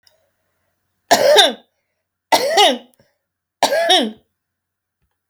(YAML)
three_cough_length: 5.3 s
three_cough_amplitude: 30906
three_cough_signal_mean_std_ratio: 0.4
survey_phase: alpha (2021-03-01 to 2021-08-12)
age: 45-64
gender: Female
wearing_mask: 'No'
symptom_none: true
smoker_status: Current smoker (1 to 10 cigarettes per day)
respiratory_condition_asthma: false
respiratory_condition_other: false
recruitment_source: REACT
submission_delay: 2 days
covid_test_method: RT-qPCR